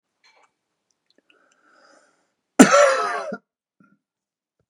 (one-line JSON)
{"cough_length": "4.7 s", "cough_amplitude": 32768, "cough_signal_mean_std_ratio": 0.25, "survey_phase": "beta (2021-08-13 to 2022-03-07)", "age": "45-64", "gender": "Male", "wearing_mask": "No", "symptom_none": true, "smoker_status": "Ex-smoker", "respiratory_condition_asthma": false, "respiratory_condition_other": false, "recruitment_source": "REACT", "submission_delay": "1 day", "covid_test_result": "Negative", "covid_test_method": "RT-qPCR", "influenza_a_test_result": "Negative", "influenza_b_test_result": "Negative"}